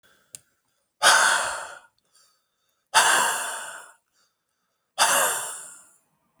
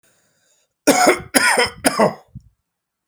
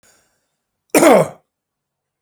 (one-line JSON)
{"exhalation_length": "6.4 s", "exhalation_amplitude": 23878, "exhalation_signal_mean_std_ratio": 0.42, "three_cough_length": "3.1 s", "three_cough_amplitude": 32768, "three_cough_signal_mean_std_ratio": 0.43, "cough_length": "2.2 s", "cough_amplitude": 30605, "cough_signal_mean_std_ratio": 0.31, "survey_phase": "beta (2021-08-13 to 2022-03-07)", "age": "45-64", "gender": "Male", "wearing_mask": "No", "symptom_none": true, "smoker_status": "Never smoked", "respiratory_condition_asthma": false, "respiratory_condition_other": false, "recruitment_source": "REACT", "submission_delay": "1 day", "covid_test_result": "Negative", "covid_test_method": "RT-qPCR"}